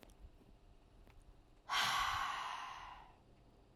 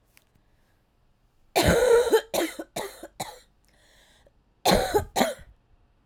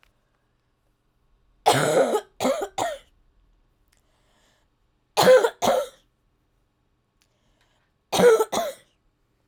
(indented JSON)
{
  "exhalation_length": "3.8 s",
  "exhalation_amplitude": 2495,
  "exhalation_signal_mean_std_ratio": 0.53,
  "cough_length": "6.1 s",
  "cough_amplitude": 16112,
  "cough_signal_mean_std_ratio": 0.41,
  "three_cough_length": "9.5 s",
  "three_cough_amplitude": 23296,
  "three_cough_signal_mean_std_ratio": 0.35,
  "survey_phase": "alpha (2021-03-01 to 2021-08-12)",
  "age": "18-44",
  "gender": "Female",
  "wearing_mask": "No",
  "symptom_cough_any": true,
  "symptom_abdominal_pain": true,
  "symptom_fatigue": true,
  "symptom_headache": true,
  "symptom_change_to_sense_of_smell_or_taste": true,
  "symptom_onset": "4 days",
  "smoker_status": "Current smoker (1 to 10 cigarettes per day)",
  "respiratory_condition_asthma": false,
  "respiratory_condition_other": false,
  "recruitment_source": "Test and Trace",
  "submission_delay": "1 day",
  "covid_test_result": "Positive",
  "covid_test_method": "RT-qPCR",
  "covid_ct_value": 18.1,
  "covid_ct_gene": "ORF1ab gene",
  "covid_ct_mean": 18.6,
  "covid_viral_load": "800000 copies/ml",
  "covid_viral_load_category": "Low viral load (10K-1M copies/ml)"
}